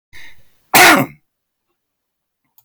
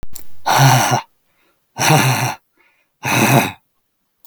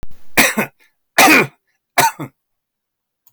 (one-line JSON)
{"cough_length": "2.6 s", "cough_amplitude": 32768, "cough_signal_mean_std_ratio": 0.32, "exhalation_length": "4.3 s", "exhalation_amplitude": 32766, "exhalation_signal_mean_std_ratio": 0.58, "three_cough_length": "3.3 s", "three_cough_amplitude": 32768, "three_cough_signal_mean_std_ratio": 0.43, "survey_phase": "beta (2021-08-13 to 2022-03-07)", "age": "65+", "gender": "Male", "wearing_mask": "No", "symptom_none": true, "smoker_status": "Never smoked", "respiratory_condition_asthma": false, "respiratory_condition_other": false, "recruitment_source": "Test and Trace", "submission_delay": "-1 day", "covid_test_result": "Negative", "covid_test_method": "LFT"}